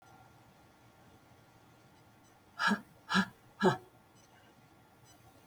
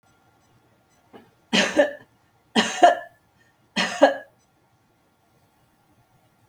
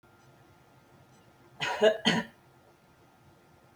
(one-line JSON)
{"exhalation_length": "5.5 s", "exhalation_amplitude": 5725, "exhalation_signal_mean_std_ratio": 0.29, "three_cough_length": "6.5 s", "three_cough_amplitude": 30584, "three_cough_signal_mean_std_ratio": 0.29, "cough_length": "3.8 s", "cough_amplitude": 10916, "cough_signal_mean_std_ratio": 0.3, "survey_phase": "beta (2021-08-13 to 2022-03-07)", "age": "45-64", "gender": "Female", "wearing_mask": "No", "symptom_none": true, "smoker_status": "Never smoked", "respiratory_condition_asthma": false, "respiratory_condition_other": false, "recruitment_source": "REACT", "submission_delay": "1 day", "covid_test_result": "Negative", "covid_test_method": "RT-qPCR", "influenza_a_test_result": "Negative", "influenza_b_test_result": "Negative"}